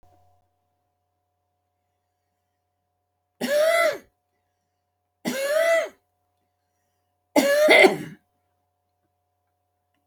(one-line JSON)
{"three_cough_length": "10.1 s", "three_cough_amplitude": 25107, "three_cough_signal_mean_std_ratio": 0.33, "survey_phase": "alpha (2021-03-01 to 2021-08-12)", "age": "65+", "gender": "Female", "wearing_mask": "No", "symptom_none": true, "smoker_status": "Ex-smoker", "respiratory_condition_asthma": false, "respiratory_condition_other": false, "recruitment_source": "REACT", "submission_delay": "1 day", "covid_test_result": "Negative", "covid_test_method": "RT-qPCR"}